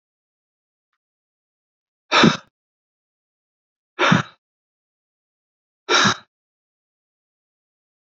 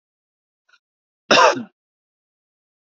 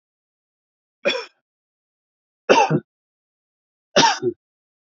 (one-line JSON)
{"exhalation_length": "8.2 s", "exhalation_amplitude": 29268, "exhalation_signal_mean_std_ratio": 0.23, "cough_length": "2.8 s", "cough_amplitude": 28749, "cough_signal_mean_std_ratio": 0.25, "three_cough_length": "4.9 s", "three_cough_amplitude": 27799, "three_cough_signal_mean_std_ratio": 0.29, "survey_phase": "alpha (2021-03-01 to 2021-08-12)", "age": "45-64", "gender": "Male", "wearing_mask": "No", "symptom_none": true, "smoker_status": "Never smoked", "respiratory_condition_asthma": true, "respiratory_condition_other": false, "recruitment_source": "REACT", "submission_delay": "2 days", "covid_test_result": "Negative", "covid_test_method": "RT-qPCR"}